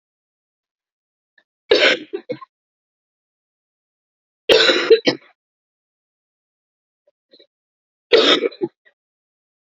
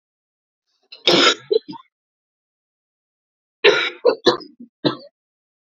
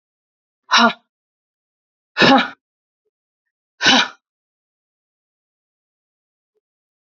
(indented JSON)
{
  "three_cough_length": "9.6 s",
  "three_cough_amplitude": 31042,
  "three_cough_signal_mean_std_ratio": 0.28,
  "cough_length": "5.7 s",
  "cough_amplitude": 29894,
  "cough_signal_mean_std_ratio": 0.31,
  "exhalation_length": "7.2 s",
  "exhalation_amplitude": 31616,
  "exhalation_signal_mean_std_ratio": 0.25,
  "survey_phase": "beta (2021-08-13 to 2022-03-07)",
  "age": "45-64",
  "gender": "Female",
  "wearing_mask": "No",
  "symptom_cough_any": true,
  "symptom_new_continuous_cough": true,
  "symptom_runny_or_blocked_nose": true,
  "symptom_shortness_of_breath": true,
  "symptom_sore_throat": true,
  "symptom_fatigue": true,
  "symptom_fever_high_temperature": true,
  "symptom_headache": true,
  "symptom_change_to_sense_of_smell_or_taste": true,
  "symptom_loss_of_taste": true,
  "symptom_onset": "6 days",
  "smoker_status": "Never smoked",
  "respiratory_condition_asthma": true,
  "respiratory_condition_other": false,
  "recruitment_source": "Test and Trace",
  "submission_delay": "5 days",
  "covid_test_result": "Positive",
  "covid_test_method": "RT-qPCR",
  "covid_ct_value": 17.0,
  "covid_ct_gene": "ORF1ab gene"
}